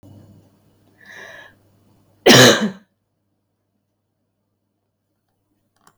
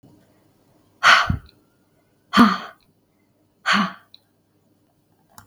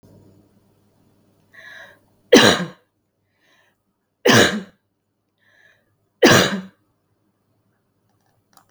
{
  "cough_length": "6.0 s",
  "cough_amplitude": 32768,
  "cough_signal_mean_std_ratio": 0.22,
  "exhalation_length": "5.5 s",
  "exhalation_amplitude": 32768,
  "exhalation_signal_mean_std_ratio": 0.29,
  "three_cough_length": "8.7 s",
  "three_cough_amplitude": 32768,
  "three_cough_signal_mean_std_ratio": 0.26,
  "survey_phase": "beta (2021-08-13 to 2022-03-07)",
  "age": "45-64",
  "gender": "Female",
  "wearing_mask": "No",
  "symptom_none": true,
  "smoker_status": "Never smoked",
  "respiratory_condition_asthma": false,
  "respiratory_condition_other": false,
  "recruitment_source": "REACT",
  "submission_delay": "1 day",
  "covid_test_result": "Negative",
  "covid_test_method": "RT-qPCR",
  "influenza_a_test_result": "Unknown/Void",
  "influenza_b_test_result": "Unknown/Void"
}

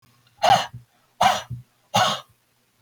{
  "exhalation_length": "2.8 s",
  "exhalation_amplitude": 20842,
  "exhalation_signal_mean_std_ratio": 0.4,
  "survey_phase": "beta (2021-08-13 to 2022-03-07)",
  "age": "45-64",
  "gender": "Male",
  "wearing_mask": "No",
  "symptom_none": true,
  "smoker_status": "Never smoked",
  "respiratory_condition_asthma": false,
  "respiratory_condition_other": false,
  "recruitment_source": "REACT",
  "submission_delay": "1 day",
  "covid_test_result": "Negative",
  "covid_test_method": "RT-qPCR",
  "influenza_a_test_result": "Negative",
  "influenza_b_test_result": "Negative"
}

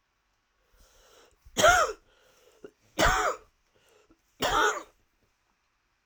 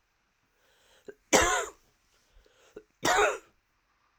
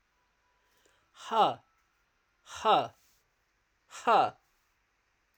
{
  "three_cough_length": "6.1 s",
  "three_cough_amplitude": 13802,
  "three_cough_signal_mean_std_ratio": 0.34,
  "cough_length": "4.2 s",
  "cough_amplitude": 17439,
  "cough_signal_mean_std_ratio": 0.32,
  "exhalation_length": "5.4 s",
  "exhalation_amplitude": 8182,
  "exhalation_signal_mean_std_ratio": 0.3,
  "survey_phase": "alpha (2021-03-01 to 2021-08-12)",
  "age": "45-64",
  "gender": "Female",
  "wearing_mask": "No",
  "symptom_cough_any": true,
  "symptom_fatigue": true,
  "symptom_fever_high_temperature": true,
  "symptom_headache": true,
  "symptom_change_to_sense_of_smell_or_taste": true,
  "symptom_loss_of_taste": true,
  "symptom_onset": "6 days",
  "smoker_status": "Never smoked",
  "respiratory_condition_asthma": false,
  "respiratory_condition_other": false,
  "recruitment_source": "Test and Trace",
  "submission_delay": "2 days",
  "covid_test_result": "Positive",
  "covid_test_method": "RT-qPCR",
  "covid_ct_value": 28.2,
  "covid_ct_gene": "N gene"
}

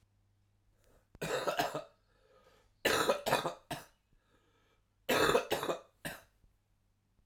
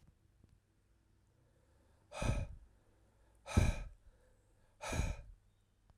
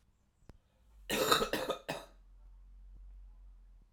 {
  "three_cough_length": "7.3 s",
  "three_cough_amplitude": 5832,
  "three_cough_signal_mean_std_ratio": 0.4,
  "exhalation_length": "6.0 s",
  "exhalation_amplitude": 4899,
  "exhalation_signal_mean_std_ratio": 0.33,
  "cough_length": "3.9 s",
  "cough_amplitude": 9666,
  "cough_signal_mean_std_ratio": 0.4,
  "survey_phase": "alpha (2021-03-01 to 2021-08-12)",
  "age": "18-44",
  "gender": "Male",
  "wearing_mask": "No",
  "symptom_cough_any": true,
  "symptom_fever_high_temperature": true,
  "symptom_headache": true,
  "symptom_onset": "3 days",
  "smoker_status": "Never smoked",
  "respiratory_condition_asthma": false,
  "respiratory_condition_other": false,
  "recruitment_source": "Test and Trace",
  "submission_delay": "2 days",
  "covid_test_result": "Positive",
  "covid_test_method": "RT-qPCR"
}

